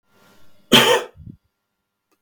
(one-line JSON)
{"exhalation_length": "2.2 s", "exhalation_amplitude": 32766, "exhalation_signal_mean_std_ratio": 0.31, "survey_phase": "beta (2021-08-13 to 2022-03-07)", "age": "45-64", "gender": "Male", "wearing_mask": "No", "symptom_cough_any": true, "symptom_sore_throat": true, "symptom_onset": "6 days", "smoker_status": "Never smoked", "respiratory_condition_asthma": true, "respiratory_condition_other": false, "recruitment_source": "REACT", "submission_delay": "2 days", "covid_test_result": "Negative", "covid_test_method": "RT-qPCR", "influenza_a_test_result": "Negative", "influenza_b_test_result": "Negative"}